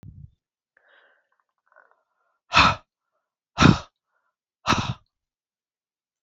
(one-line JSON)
{"exhalation_length": "6.2 s", "exhalation_amplitude": 29697, "exhalation_signal_mean_std_ratio": 0.23, "survey_phase": "beta (2021-08-13 to 2022-03-07)", "age": "65+", "gender": "Female", "wearing_mask": "No", "symptom_cough_any": true, "symptom_fatigue": true, "symptom_onset": "6 days", "smoker_status": "Never smoked", "respiratory_condition_asthma": false, "respiratory_condition_other": false, "recruitment_source": "Test and Trace", "submission_delay": "2 days", "covid_test_result": "Positive", "covid_test_method": "RT-qPCR", "covid_ct_value": 17.4, "covid_ct_gene": "ORF1ab gene", "covid_ct_mean": 17.5, "covid_viral_load": "1800000 copies/ml", "covid_viral_load_category": "High viral load (>1M copies/ml)"}